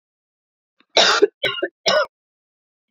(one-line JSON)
{"three_cough_length": "2.9 s", "three_cough_amplitude": 27683, "three_cough_signal_mean_std_ratio": 0.37, "survey_phase": "beta (2021-08-13 to 2022-03-07)", "age": "45-64", "gender": "Female", "wearing_mask": "No", "symptom_runny_or_blocked_nose": true, "symptom_shortness_of_breath": true, "symptom_sore_throat": true, "symptom_fatigue": true, "symptom_fever_high_temperature": true, "symptom_headache": true, "smoker_status": "Never smoked", "respiratory_condition_asthma": false, "respiratory_condition_other": false, "recruitment_source": "Test and Trace", "submission_delay": "2 days", "covid_test_result": "Positive", "covid_test_method": "ePCR"}